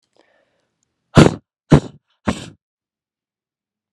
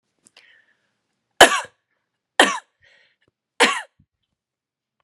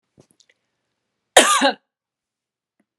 {"exhalation_length": "3.9 s", "exhalation_amplitude": 32768, "exhalation_signal_mean_std_ratio": 0.21, "three_cough_length": "5.0 s", "three_cough_amplitude": 32768, "three_cough_signal_mean_std_ratio": 0.21, "cough_length": "3.0 s", "cough_amplitude": 32768, "cough_signal_mean_std_ratio": 0.25, "survey_phase": "beta (2021-08-13 to 2022-03-07)", "age": "45-64", "gender": "Female", "wearing_mask": "No", "symptom_none": true, "smoker_status": "Never smoked", "respiratory_condition_asthma": false, "respiratory_condition_other": false, "recruitment_source": "REACT", "submission_delay": "2 days", "covid_test_result": "Negative", "covid_test_method": "RT-qPCR"}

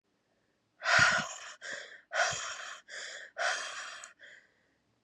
{"exhalation_length": "5.0 s", "exhalation_amplitude": 7752, "exhalation_signal_mean_std_ratio": 0.45, "survey_phase": "beta (2021-08-13 to 2022-03-07)", "age": "18-44", "gender": "Female", "wearing_mask": "No", "symptom_cough_any": true, "symptom_shortness_of_breath": true, "symptom_fatigue": true, "symptom_fever_high_temperature": true, "symptom_headache": true, "symptom_change_to_sense_of_smell_or_taste": true, "symptom_onset": "6 days", "smoker_status": "Current smoker (1 to 10 cigarettes per day)", "respiratory_condition_asthma": false, "respiratory_condition_other": false, "recruitment_source": "Test and Trace", "submission_delay": "2 days", "covid_test_result": "Positive", "covid_test_method": "RT-qPCR", "covid_ct_value": 20.8, "covid_ct_gene": "ORF1ab gene"}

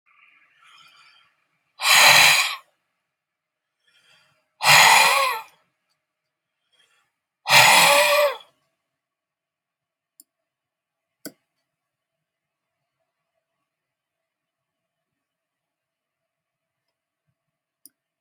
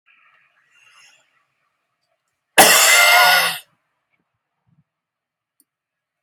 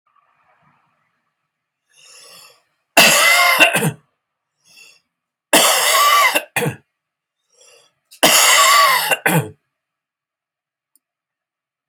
{"exhalation_length": "18.2 s", "exhalation_amplitude": 32333, "exhalation_signal_mean_std_ratio": 0.28, "cough_length": "6.2 s", "cough_amplitude": 32768, "cough_signal_mean_std_ratio": 0.32, "three_cough_length": "11.9 s", "three_cough_amplitude": 32768, "three_cough_signal_mean_std_ratio": 0.43, "survey_phase": "beta (2021-08-13 to 2022-03-07)", "age": "65+", "gender": "Male", "wearing_mask": "No", "symptom_cough_any": true, "smoker_status": "Ex-smoker", "respiratory_condition_asthma": false, "respiratory_condition_other": false, "recruitment_source": "REACT", "submission_delay": "3 days", "covid_test_result": "Negative", "covid_test_method": "RT-qPCR"}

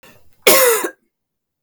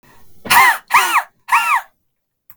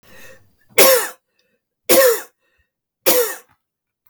{"cough_length": "1.6 s", "cough_amplitude": 32768, "cough_signal_mean_std_ratio": 0.41, "exhalation_length": "2.6 s", "exhalation_amplitude": 32768, "exhalation_signal_mean_std_ratio": 0.5, "three_cough_length": "4.1 s", "three_cough_amplitude": 32768, "three_cough_signal_mean_std_ratio": 0.37, "survey_phase": "beta (2021-08-13 to 2022-03-07)", "age": "45-64", "gender": "Female", "wearing_mask": "No", "symptom_none": true, "smoker_status": "Never smoked", "respiratory_condition_asthma": true, "respiratory_condition_other": false, "recruitment_source": "REACT", "submission_delay": "1 day", "covid_test_result": "Negative", "covid_test_method": "RT-qPCR"}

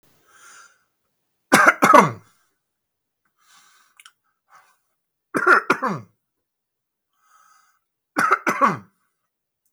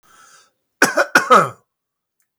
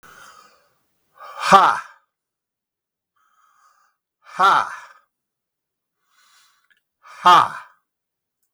{"three_cough_length": "9.7 s", "three_cough_amplitude": 32768, "three_cough_signal_mean_std_ratio": 0.28, "cough_length": "2.4 s", "cough_amplitude": 32768, "cough_signal_mean_std_ratio": 0.34, "exhalation_length": "8.5 s", "exhalation_amplitude": 32768, "exhalation_signal_mean_std_ratio": 0.26, "survey_phase": "beta (2021-08-13 to 2022-03-07)", "age": "65+", "gender": "Male", "wearing_mask": "No", "symptom_sore_throat": true, "smoker_status": "Never smoked", "respiratory_condition_asthma": false, "respiratory_condition_other": false, "recruitment_source": "REACT", "submission_delay": "3 days", "covid_test_result": "Negative", "covid_test_method": "RT-qPCR", "influenza_a_test_result": "Negative", "influenza_b_test_result": "Negative"}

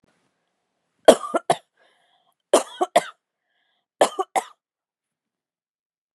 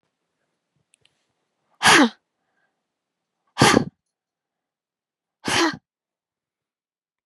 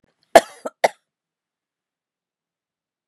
{"three_cough_length": "6.1 s", "three_cough_amplitude": 32768, "three_cough_signal_mean_std_ratio": 0.21, "exhalation_length": "7.3 s", "exhalation_amplitude": 31999, "exhalation_signal_mean_std_ratio": 0.25, "cough_length": "3.1 s", "cough_amplitude": 32768, "cough_signal_mean_std_ratio": 0.13, "survey_phase": "beta (2021-08-13 to 2022-03-07)", "age": "18-44", "gender": "Female", "wearing_mask": "No", "symptom_none": true, "smoker_status": "Never smoked", "respiratory_condition_asthma": false, "respiratory_condition_other": false, "recruitment_source": "REACT", "submission_delay": "2 days", "covid_test_result": "Negative", "covid_test_method": "RT-qPCR", "influenza_a_test_result": "Negative", "influenza_b_test_result": "Negative"}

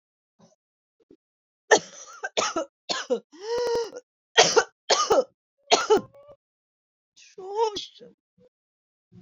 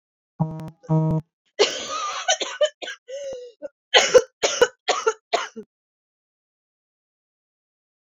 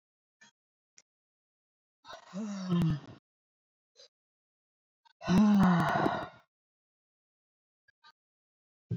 {"three_cough_length": "9.2 s", "three_cough_amplitude": 27195, "three_cough_signal_mean_std_ratio": 0.36, "cough_length": "8.0 s", "cough_amplitude": 30259, "cough_signal_mean_std_ratio": 0.38, "exhalation_length": "9.0 s", "exhalation_amplitude": 5859, "exhalation_signal_mean_std_ratio": 0.36, "survey_phase": "beta (2021-08-13 to 2022-03-07)", "age": "18-44", "gender": "Female", "wearing_mask": "No", "symptom_cough_any": true, "symptom_runny_or_blocked_nose": true, "symptom_shortness_of_breath": true, "symptom_sore_throat": true, "symptom_abdominal_pain": true, "symptom_fatigue": true, "symptom_fever_high_temperature": true, "symptom_headache": true, "symptom_change_to_sense_of_smell_or_taste": true, "symptom_other": true, "symptom_onset": "3 days", "smoker_status": "Never smoked", "respiratory_condition_asthma": false, "respiratory_condition_other": false, "recruitment_source": "Test and Trace", "submission_delay": "1 day", "covid_test_result": "Positive", "covid_test_method": "RT-qPCR"}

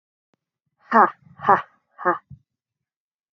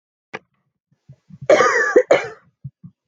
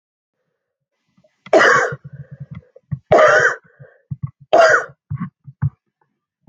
{"exhalation_length": "3.3 s", "exhalation_amplitude": 30366, "exhalation_signal_mean_std_ratio": 0.26, "cough_length": "3.1 s", "cough_amplitude": 27462, "cough_signal_mean_std_ratio": 0.37, "three_cough_length": "6.5 s", "three_cough_amplitude": 30558, "three_cough_signal_mean_std_ratio": 0.39, "survey_phase": "beta (2021-08-13 to 2022-03-07)", "age": "18-44", "gender": "Female", "wearing_mask": "No", "symptom_cough_any": true, "symptom_new_continuous_cough": true, "symptom_runny_or_blocked_nose": true, "symptom_headache": true, "symptom_onset": "12 days", "smoker_status": "Never smoked", "respiratory_condition_asthma": false, "respiratory_condition_other": false, "recruitment_source": "REACT", "submission_delay": "1 day", "covid_test_result": "Negative", "covid_test_method": "RT-qPCR"}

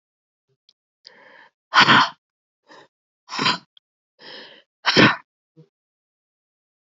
{"exhalation_length": "7.0 s", "exhalation_amplitude": 31524, "exhalation_signal_mean_std_ratio": 0.26, "survey_phase": "beta (2021-08-13 to 2022-03-07)", "age": "18-44", "gender": "Female", "wearing_mask": "No", "symptom_cough_any": true, "symptom_headache": true, "symptom_change_to_sense_of_smell_or_taste": true, "smoker_status": "Never smoked", "respiratory_condition_asthma": false, "respiratory_condition_other": false, "recruitment_source": "Test and Trace", "submission_delay": "2 days", "covid_test_result": "Positive", "covid_test_method": "RT-qPCR"}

